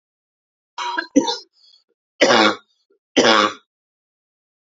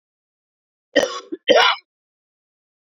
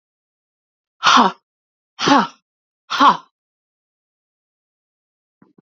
{"three_cough_length": "4.7 s", "three_cough_amplitude": 29149, "three_cough_signal_mean_std_ratio": 0.36, "cough_length": "3.0 s", "cough_amplitude": 27766, "cough_signal_mean_std_ratio": 0.3, "exhalation_length": "5.6 s", "exhalation_amplitude": 28710, "exhalation_signal_mean_std_ratio": 0.28, "survey_phase": "beta (2021-08-13 to 2022-03-07)", "age": "45-64", "gender": "Female", "wearing_mask": "No", "symptom_cough_any": true, "symptom_runny_or_blocked_nose": true, "symptom_fatigue": true, "symptom_headache": true, "symptom_change_to_sense_of_smell_or_taste": true, "symptom_loss_of_taste": true, "symptom_onset": "2 days", "smoker_status": "Never smoked", "respiratory_condition_asthma": false, "respiratory_condition_other": false, "recruitment_source": "Test and Trace", "submission_delay": "2 days", "covid_test_result": "Positive", "covid_test_method": "RT-qPCR", "covid_ct_value": 24.6, "covid_ct_gene": "ORF1ab gene"}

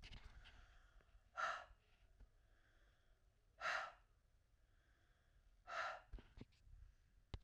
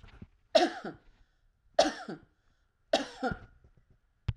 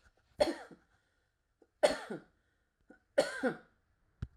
{"exhalation_length": "7.4 s", "exhalation_amplitude": 833, "exhalation_signal_mean_std_ratio": 0.42, "three_cough_length": "4.4 s", "three_cough_amplitude": 10386, "three_cough_signal_mean_std_ratio": 0.3, "cough_length": "4.4 s", "cough_amplitude": 7363, "cough_signal_mean_std_ratio": 0.29, "survey_phase": "alpha (2021-03-01 to 2021-08-12)", "age": "65+", "gender": "Female", "wearing_mask": "No", "symptom_none": true, "smoker_status": "Ex-smoker", "respiratory_condition_asthma": false, "respiratory_condition_other": false, "recruitment_source": "REACT", "submission_delay": "1 day", "covid_test_result": "Negative", "covid_test_method": "RT-qPCR"}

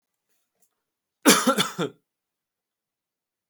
{"cough_length": "3.5 s", "cough_amplitude": 25745, "cough_signal_mean_std_ratio": 0.26, "survey_phase": "alpha (2021-03-01 to 2021-08-12)", "age": "18-44", "gender": "Male", "wearing_mask": "No", "symptom_none": true, "smoker_status": "Never smoked", "respiratory_condition_asthma": false, "respiratory_condition_other": false, "recruitment_source": "REACT", "submission_delay": "3 days", "covid_test_result": "Negative", "covid_test_method": "RT-qPCR"}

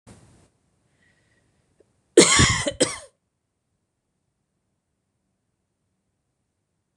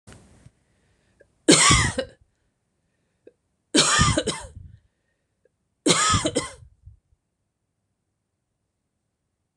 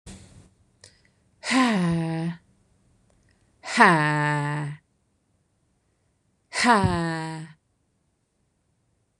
{"cough_length": "7.0 s", "cough_amplitude": 26027, "cough_signal_mean_std_ratio": 0.21, "three_cough_length": "9.6 s", "three_cough_amplitude": 25995, "three_cough_signal_mean_std_ratio": 0.32, "exhalation_length": "9.2 s", "exhalation_amplitude": 25290, "exhalation_signal_mean_std_ratio": 0.41, "survey_phase": "beta (2021-08-13 to 2022-03-07)", "age": "45-64", "gender": "Female", "wearing_mask": "No", "symptom_none": true, "smoker_status": "Never smoked", "respiratory_condition_asthma": false, "respiratory_condition_other": false, "recruitment_source": "REACT", "submission_delay": "2 days", "covid_test_result": "Negative", "covid_test_method": "RT-qPCR", "influenza_a_test_result": "Negative", "influenza_b_test_result": "Negative"}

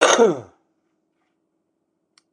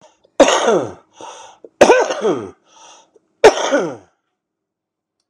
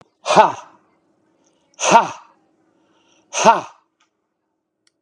{"cough_length": "2.3 s", "cough_amplitude": 31814, "cough_signal_mean_std_ratio": 0.31, "three_cough_length": "5.3 s", "three_cough_amplitude": 32768, "three_cough_signal_mean_std_ratio": 0.39, "exhalation_length": "5.0 s", "exhalation_amplitude": 32768, "exhalation_signal_mean_std_ratio": 0.29, "survey_phase": "beta (2021-08-13 to 2022-03-07)", "age": "45-64", "gender": "Male", "wearing_mask": "No", "symptom_cough_any": true, "smoker_status": "Never smoked", "respiratory_condition_asthma": false, "respiratory_condition_other": true, "recruitment_source": "REACT", "submission_delay": "1 day", "covid_test_result": "Negative", "covid_test_method": "RT-qPCR", "influenza_a_test_result": "Negative", "influenza_b_test_result": "Negative"}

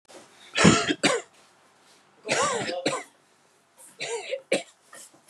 {"three_cough_length": "5.3 s", "three_cough_amplitude": 27800, "three_cough_signal_mean_std_ratio": 0.42, "survey_phase": "beta (2021-08-13 to 2022-03-07)", "age": "45-64", "gender": "Male", "wearing_mask": "No", "symptom_none": true, "smoker_status": "Never smoked", "respiratory_condition_asthma": false, "respiratory_condition_other": false, "recruitment_source": "REACT", "submission_delay": "1 day", "covid_test_result": "Negative", "covid_test_method": "RT-qPCR", "influenza_a_test_result": "Negative", "influenza_b_test_result": "Negative"}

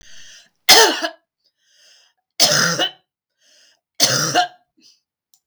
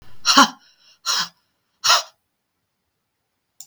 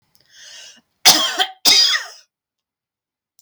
{"three_cough_length": "5.5 s", "three_cough_amplitude": 32768, "three_cough_signal_mean_std_ratio": 0.37, "exhalation_length": "3.7 s", "exhalation_amplitude": 32768, "exhalation_signal_mean_std_ratio": 0.31, "cough_length": "3.4 s", "cough_amplitude": 32768, "cough_signal_mean_std_ratio": 0.37, "survey_phase": "beta (2021-08-13 to 2022-03-07)", "age": "45-64", "gender": "Female", "wearing_mask": "No", "symptom_none": true, "smoker_status": "Never smoked", "respiratory_condition_asthma": false, "respiratory_condition_other": false, "recruitment_source": "REACT", "submission_delay": "1 day", "covid_test_result": "Negative", "covid_test_method": "RT-qPCR", "influenza_a_test_result": "Unknown/Void", "influenza_b_test_result": "Unknown/Void"}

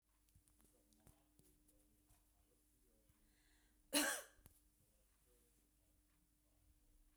{"cough_length": "7.2 s", "cough_amplitude": 2080, "cough_signal_mean_std_ratio": 0.21, "survey_phase": "beta (2021-08-13 to 2022-03-07)", "age": "45-64", "gender": "Female", "wearing_mask": "No", "symptom_cough_any": true, "symptom_runny_or_blocked_nose": true, "symptom_headache": true, "smoker_status": "Never smoked", "respiratory_condition_asthma": false, "respiratory_condition_other": false, "recruitment_source": "Test and Trace", "submission_delay": "1 day", "covid_test_result": "Positive", "covid_test_method": "RT-qPCR", "covid_ct_value": 32.3, "covid_ct_gene": "ORF1ab gene", "covid_ct_mean": 34.6, "covid_viral_load": "4.5 copies/ml", "covid_viral_load_category": "Minimal viral load (< 10K copies/ml)"}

